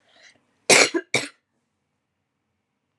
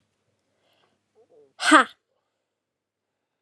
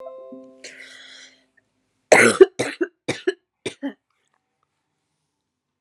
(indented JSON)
{
  "cough_length": "3.0 s",
  "cough_amplitude": 29731,
  "cough_signal_mean_std_ratio": 0.25,
  "exhalation_length": "3.4 s",
  "exhalation_amplitude": 29142,
  "exhalation_signal_mean_std_ratio": 0.18,
  "three_cough_length": "5.8 s",
  "three_cough_amplitude": 32767,
  "three_cough_signal_mean_std_ratio": 0.24,
  "survey_phase": "alpha (2021-03-01 to 2021-08-12)",
  "age": "18-44",
  "gender": "Female",
  "wearing_mask": "No",
  "symptom_cough_any": true,
  "smoker_status": "Never smoked",
  "respiratory_condition_asthma": false,
  "respiratory_condition_other": false,
  "recruitment_source": "Test and Trace",
  "submission_delay": "2 days",
  "covid_test_result": "Positive",
  "covid_test_method": "RT-qPCR",
  "covid_ct_value": 23.0,
  "covid_ct_gene": "ORF1ab gene"
}